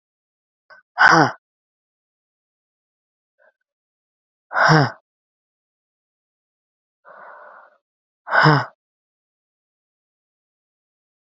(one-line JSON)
{"exhalation_length": "11.3 s", "exhalation_amplitude": 32656, "exhalation_signal_mean_std_ratio": 0.23, "survey_phase": "beta (2021-08-13 to 2022-03-07)", "age": "45-64", "gender": "Female", "wearing_mask": "No", "symptom_cough_any": true, "symptom_runny_or_blocked_nose": true, "symptom_sore_throat": true, "symptom_fatigue": true, "symptom_headache": true, "symptom_change_to_sense_of_smell_or_taste": true, "symptom_onset": "5 days", "smoker_status": "Never smoked", "respiratory_condition_asthma": true, "respiratory_condition_other": false, "recruitment_source": "Test and Trace", "submission_delay": "2 days", "covid_test_result": "Positive", "covid_test_method": "RT-qPCR", "covid_ct_value": 14.4, "covid_ct_gene": "ORF1ab gene"}